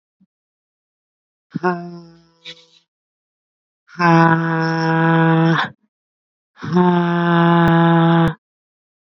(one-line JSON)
{"exhalation_length": "9.0 s", "exhalation_amplitude": 27546, "exhalation_signal_mean_std_ratio": 0.58, "survey_phase": "beta (2021-08-13 to 2022-03-07)", "age": "18-44", "gender": "Female", "wearing_mask": "No", "symptom_cough_any": true, "symptom_runny_or_blocked_nose": true, "symptom_sore_throat": true, "symptom_headache": true, "symptom_onset": "13 days", "smoker_status": "Current smoker (11 or more cigarettes per day)", "respiratory_condition_asthma": false, "respiratory_condition_other": true, "recruitment_source": "REACT", "submission_delay": "1 day", "covid_test_result": "Negative", "covid_test_method": "RT-qPCR", "influenza_a_test_result": "Unknown/Void", "influenza_b_test_result": "Unknown/Void"}